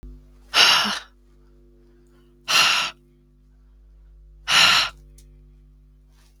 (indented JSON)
{
  "exhalation_length": "6.4 s",
  "exhalation_amplitude": 32766,
  "exhalation_signal_mean_std_ratio": 0.38,
  "survey_phase": "beta (2021-08-13 to 2022-03-07)",
  "age": "18-44",
  "gender": "Female",
  "wearing_mask": "Yes",
  "symptom_cough_any": true,
  "symptom_runny_or_blocked_nose": true,
  "symptom_sore_throat": true,
  "symptom_diarrhoea": true,
  "symptom_fatigue": true,
  "symptom_headache": true,
  "symptom_other": true,
  "symptom_onset": "4 days",
  "smoker_status": "Never smoked",
  "respiratory_condition_asthma": false,
  "respiratory_condition_other": false,
  "recruitment_source": "Test and Trace",
  "submission_delay": "1 day",
  "covid_test_result": "Positive",
  "covid_test_method": "RT-qPCR",
  "covid_ct_value": 17.1,
  "covid_ct_gene": "ORF1ab gene",
  "covid_ct_mean": 17.5,
  "covid_viral_load": "1800000 copies/ml",
  "covid_viral_load_category": "High viral load (>1M copies/ml)"
}